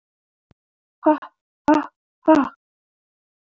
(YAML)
exhalation_length: 3.4 s
exhalation_amplitude: 23506
exhalation_signal_mean_std_ratio: 0.29
survey_phase: beta (2021-08-13 to 2022-03-07)
age: 18-44
gender: Female
wearing_mask: 'No'
symptom_cough_any: true
symptom_runny_or_blocked_nose: true
symptom_shortness_of_breath: true
symptom_fatigue: true
symptom_other: true
symptom_onset: 4 days
smoker_status: Never smoked
respiratory_condition_asthma: false
respiratory_condition_other: false
recruitment_source: Test and Trace
submission_delay: 1 day
covid_test_result: Positive
covid_test_method: RT-qPCR
covid_ct_value: 16.2
covid_ct_gene: ORF1ab gene
covid_ct_mean: 16.6
covid_viral_load: 3600000 copies/ml
covid_viral_load_category: High viral load (>1M copies/ml)